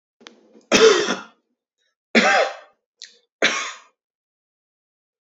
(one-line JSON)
{"three_cough_length": "5.3 s", "three_cough_amplitude": 27840, "three_cough_signal_mean_std_ratio": 0.34, "survey_phase": "beta (2021-08-13 to 2022-03-07)", "age": "18-44", "gender": "Male", "wearing_mask": "No", "symptom_cough_any": true, "symptom_sore_throat": true, "symptom_fatigue": true, "symptom_headache": true, "symptom_onset": "9 days", "smoker_status": "Ex-smoker", "respiratory_condition_asthma": false, "respiratory_condition_other": false, "recruitment_source": "REACT", "submission_delay": "1 day", "covid_test_result": "Positive", "covid_test_method": "RT-qPCR", "covid_ct_value": 34.0, "covid_ct_gene": "E gene", "influenza_a_test_result": "Negative", "influenza_b_test_result": "Negative"}